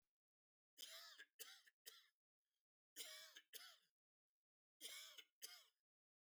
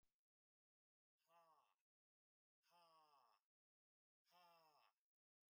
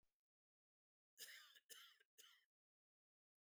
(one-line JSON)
{"three_cough_length": "6.2 s", "three_cough_amplitude": 395, "three_cough_signal_mean_std_ratio": 0.45, "exhalation_length": "5.5 s", "exhalation_amplitude": 29, "exhalation_signal_mean_std_ratio": 0.48, "cough_length": "3.4 s", "cough_amplitude": 214, "cough_signal_mean_std_ratio": 0.37, "survey_phase": "beta (2021-08-13 to 2022-03-07)", "age": "45-64", "gender": "Male", "wearing_mask": "No", "symptom_none": true, "smoker_status": "Never smoked", "respiratory_condition_asthma": false, "respiratory_condition_other": false, "recruitment_source": "REACT", "submission_delay": "3 days", "covid_test_result": "Negative", "covid_test_method": "RT-qPCR", "influenza_a_test_result": "Unknown/Void", "influenza_b_test_result": "Unknown/Void"}